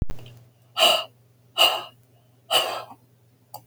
{"exhalation_length": "3.7 s", "exhalation_amplitude": 19522, "exhalation_signal_mean_std_ratio": 0.42, "survey_phase": "beta (2021-08-13 to 2022-03-07)", "age": "65+", "gender": "Female", "wearing_mask": "No", "symptom_none": true, "smoker_status": "Never smoked", "respiratory_condition_asthma": false, "respiratory_condition_other": false, "recruitment_source": "REACT", "submission_delay": "5 days", "covid_test_result": "Negative", "covid_test_method": "RT-qPCR", "influenza_a_test_result": "Negative", "influenza_b_test_result": "Negative"}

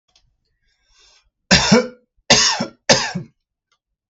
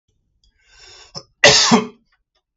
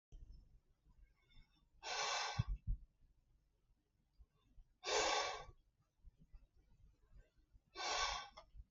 {"three_cough_length": "4.1 s", "three_cough_amplitude": 32768, "three_cough_signal_mean_std_ratio": 0.36, "cough_length": "2.6 s", "cough_amplitude": 32768, "cough_signal_mean_std_ratio": 0.32, "exhalation_length": "8.7 s", "exhalation_amplitude": 1948, "exhalation_signal_mean_std_ratio": 0.42, "survey_phase": "beta (2021-08-13 to 2022-03-07)", "age": "18-44", "gender": "Male", "wearing_mask": "No", "symptom_none": true, "smoker_status": "Ex-smoker", "respiratory_condition_asthma": false, "respiratory_condition_other": false, "recruitment_source": "REACT", "submission_delay": "15 days", "covid_test_result": "Negative", "covid_test_method": "RT-qPCR", "influenza_a_test_result": "Negative", "influenza_b_test_result": "Negative"}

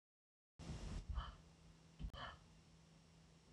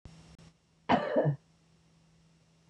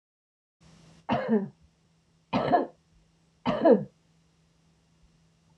{"exhalation_length": "3.5 s", "exhalation_amplitude": 668, "exhalation_signal_mean_std_ratio": 0.56, "cough_length": "2.7 s", "cough_amplitude": 7616, "cough_signal_mean_std_ratio": 0.35, "three_cough_length": "5.6 s", "three_cough_amplitude": 14234, "three_cough_signal_mean_std_ratio": 0.32, "survey_phase": "alpha (2021-03-01 to 2021-08-12)", "age": "45-64", "gender": "Female", "wearing_mask": "No", "symptom_none": true, "smoker_status": "Ex-smoker", "respiratory_condition_asthma": false, "respiratory_condition_other": false, "recruitment_source": "REACT", "submission_delay": "3 days", "covid_test_result": "Negative", "covid_test_method": "RT-qPCR"}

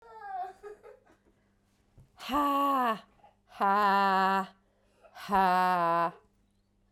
{"exhalation_length": "6.9 s", "exhalation_amplitude": 7007, "exhalation_signal_mean_std_ratio": 0.55, "survey_phase": "beta (2021-08-13 to 2022-03-07)", "age": "45-64", "gender": "Female", "wearing_mask": "No", "symptom_cough_any": true, "symptom_runny_or_blocked_nose": true, "symptom_headache": true, "symptom_change_to_sense_of_smell_or_taste": true, "symptom_loss_of_taste": true, "symptom_other": true, "symptom_onset": "4 days", "smoker_status": "Never smoked", "respiratory_condition_asthma": false, "respiratory_condition_other": false, "recruitment_source": "Test and Trace", "submission_delay": "2 days", "covid_test_result": "Positive", "covid_test_method": "RT-qPCR", "covid_ct_value": 13.2, "covid_ct_gene": "ORF1ab gene", "covid_ct_mean": 13.7, "covid_viral_load": "32000000 copies/ml", "covid_viral_load_category": "High viral load (>1M copies/ml)"}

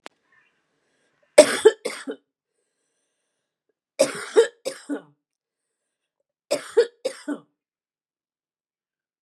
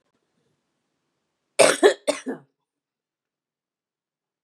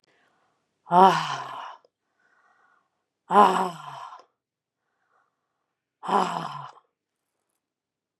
{"three_cough_length": "9.2 s", "three_cough_amplitude": 32768, "three_cough_signal_mean_std_ratio": 0.22, "cough_length": "4.4 s", "cough_amplitude": 30226, "cough_signal_mean_std_ratio": 0.22, "exhalation_length": "8.2 s", "exhalation_amplitude": 25983, "exhalation_signal_mean_std_ratio": 0.27, "survey_phase": "beta (2021-08-13 to 2022-03-07)", "age": "45-64", "gender": "Female", "wearing_mask": "No", "symptom_none": true, "smoker_status": "Never smoked", "respiratory_condition_asthma": false, "respiratory_condition_other": false, "recruitment_source": "REACT", "submission_delay": "1 day", "covid_test_result": "Negative", "covid_test_method": "RT-qPCR", "influenza_a_test_result": "Negative", "influenza_b_test_result": "Negative"}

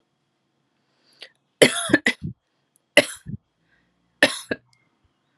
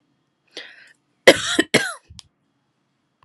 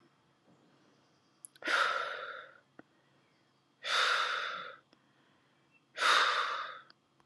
{"three_cough_length": "5.4 s", "three_cough_amplitude": 32768, "three_cough_signal_mean_std_ratio": 0.23, "cough_length": "3.2 s", "cough_amplitude": 32768, "cough_signal_mean_std_ratio": 0.24, "exhalation_length": "7.3 s", "exhalation_amplitude": 6481, "exhalation_signal_mean_std_ratio": 0.45, "survey_phase": "alpha (2021-03-01 to 2021-08-12)", "age": "18-44", "gender": "Female", "wearing_mask": "No", "symptom_cough_any": true, "symptom_shortness_of_breath": true, "symptom_diarrhoea": true, "symptom_fatigue": true, "symptom_headache": true, "symptom_onset": "3 days", "smoker_status": "Never smoked", "respiratory_condition_asthma": false, "respiratory_condition_other": false, "recruitment_source": "Test and Trace", "submission_delay": "2 days", "covid_test_result": "Positive", "covid_test_method": "ePCR"}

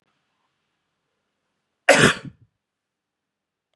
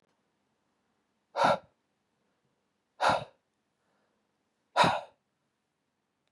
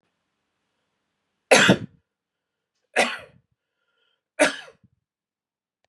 {"cough_length": "3.8 s", "cough_amplitude": 32231, "cough_signal_mean_std_ratio": 0.2, "exhalation_length": "6.3 s", "exhalation_amplitude": 9909, "exhalation_signal_mean_std_ratio": 0.25, "three_cough_length": "5.9 s", "three_cough_amplitude": 29950, "three_cough_signal_mean_std_ratio": 0.23, "survey_phase": "beta (2021-08-13 to 2022-03-07)", "age": "18-44", "gender": "Male", "wearing_mask": "No", "symptom_runny_or_blocked_nose": true, "symptom_onset": "8 days", "smoker_status": "Never smoked", "respiratory_condition_asthma": false, "respiratory_condition_other": false, "recruitment_source": "REACT", "submission_delay": "1 day", "covid_test_result": "Negative", "covid_test_method": "RT-qPCR", "influenza_a_test_result": "Negative", "influenza_b_test_result": "Negative"}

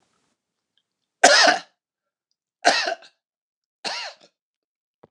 {"three_cough_length": "5.1 s", "three_cough_amplitude": 29204, "three_cough_signal_mean_std_ratio": 0.28, "survey_phase": "beta (2021-08-13 to 2022-03-07)", "age": "65+", "gender": "Male", "wearing_mask": "No", "symptom_none": true, "smoker_status": "Ex-smoker", "respiratory_condition_asthma": false, "respiratory_condition_other": false, "recruitment_source": "REACT", "submission_delay": "4 days", "covid_test_result": "Negative", "covid_test_method": "RT-qPCR", "influenza_a_test_result": "Negative", "influenza_b_test_result": "Negative"}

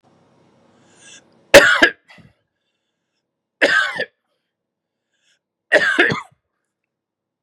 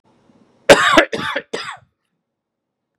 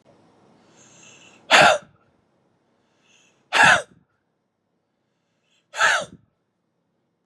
{"three_cough_length": "7.4 s", "three_cough_amplitude": 32768, "three_cough_signal_mean_std_ratio": 0.28, "cough_length": "3.0 s", "cough_amplitude": 32768, "cough_signal_mean_std_ratio": 0.32, "exhalation_length": "7.3 s", "exhalation_amplitude": 30625, "exhalation_signal_mean_std_ratio": 0.26, "survey_phase": "beta (2021-08-13 to 2022-03-07)", "age": "45-64", "gender": "Male", "wearing_mask": "No", "symptom_cough_any": true, "symptom_runny_or_blocked_nose": true, "symptom_shortness_of_breath": true, "symptom_sore_throat": true, "symptom_onset": "12 days", "smoker_status": "Ex-smoker", "respiratory_condition_asthma": false, "respiratory_condition_other": false, "recruitment_source": "REACT", "submission_delay": "0 days", "covid_test_result": "Negative", "covid_test_method": "RT-qPCR", "covid_ct_value": 39.0, "covid_ct_gene": "N gene", "influenza_a_test_result": "Negative", "influenza_b_test_result": "Negative"}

